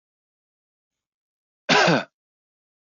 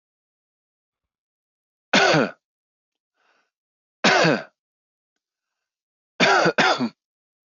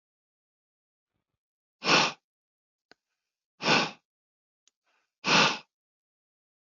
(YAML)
cough_length: 2.9 s
cough_amplitude: 17921
cough_signal_mean_std_ratio: 0.27
three_cough_length: 7.5 s
three_cough_amplitude: 20119
three_cough_signal_mean_std_ratio: 0.34
exhalation_length: 6.7 s
exhalation_amplitude: 12668
exhalation_signal_mean_std_ratio: 0.27
survey_phase: alpha (2021-03-01 to 2021-08-12)
age: 18-44
gender: Male
wearing_mask: 'No'
symptom_none: true
smoker_status: Never smoked
respiratory_condition_asthma: false
respiratory_condition_other: false
recruitment_source: REACT
submission_delay: 1 day
covid_test_result: Negative
covid_test_method: RT-qPCR